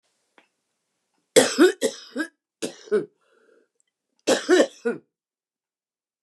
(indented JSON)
{
  "three_cough_length": "6.2 s",
  "three_cough_amplitude": 30231,
  "three_cough_signal_mean_std_ratio": 0.31,
  "survey_phase": "beta (2021-08-13 to 2022-03-07)",
  "age": "65+",
  "gender": "Female",
  "wearing_mask": "No",
  "symptom_cough_any": true,
  "symptom_runny_or_blocked_nose": true,
  "symptom_shortness_of_breath": true,
  "symptom_sore_throat": true,
  "symptom_fever_high_temperature": true,
  "symptom_headache": true,
  "smoker_status": "Never smoked",
  "respiratory_condition_asthma": false,
  "respiratory_condition_other": false,
  "recruitment_source": "Test and Trace",
  "submission_delay": "1 day",
  "covid_test_result": "Positive",
  "covid_test_method": "LFT"
}